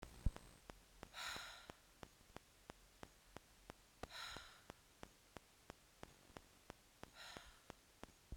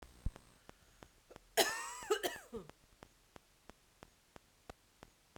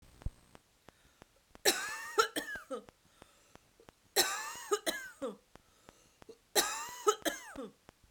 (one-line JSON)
{"exhalation_length": "8.4 s", "exhalation_amplitude": 2110, "exhalation_signal_mean_std_ratio": 0.37, "cough_length": "5.4 s", "cough_amplitude": 5117, "cough_signal_mean_std_ratio": 0.3, "three_cough_length": "8.1 s", "three_cough_amplitude": 9304, "three_cough_signal_mean_std_ratio": 0.38, "survey_phase": "beta (2021-08-13 to 2022-03-07)", "age": "45-64", "gender": "Female", "wearing_mask": "No", "symptom_cough_any": true, "symptom_runny_or_blocked_nose": true, "symptom_change_to_sense_of_smell_or_taste": true, "symptom_loss_of_taste": true, "symptom_onset": "7 days", "smoker_status": "Ex-smoker", "respiratory_condition_asthma": false, "respiratory_condition_other": false, "recruitment_source": "Test and Trace", "submission_delay": "1 day", "covid_test_result": "Positive", "covid_test_method": "RT-qPCR", "covid_ct_value": 35.7, "covid_ct_gene": "ORF1ab gene"}